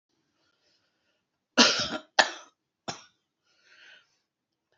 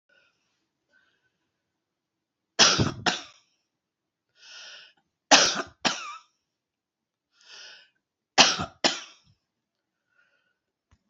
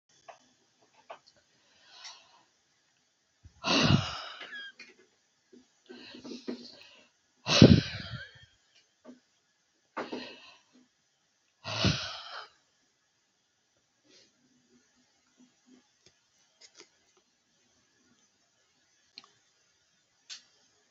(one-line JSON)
{"cough_length": "4.8 s", "cough_amplitude": 27018, "cough_signal_mean_std_ratio": 0.22, "three_cough_length": "11.1 s", "three_cough_amplitude": 29245, "three_cough_signal_mean_std_ratio": 0.24, "exhalation_length": "20.9 s", "exhalation_amplitude": 25238, "exhalation_signal_mean_std_ratio": 0.2, "survey_phase": "beta (2021-08-13 to 2022-03-07)", "age": "65+", "gender": "Female", "wearing_mask": "No", "symptom_cough_any": true, "symptom_new_continuous_cough": true, "symptom_runny_or_blocked_nose": true, "symptom_shortness_of_breath": true, "symptom_sore_throat": true, "symptom_diarrhoea": true, "symptom_fatigue": true, "symptom_change_to_sense_of_smell_or_taste": true, "symptom_other": true, "smoker_status": "Never smoked", "respiratory_condition_asthma": false, "respiratory_condition_other": true, "recruitment_source": "Test and Trace", "submission_delay": "1 day", "covid_test_result": "Positive", "covid_test_method": "LFT"}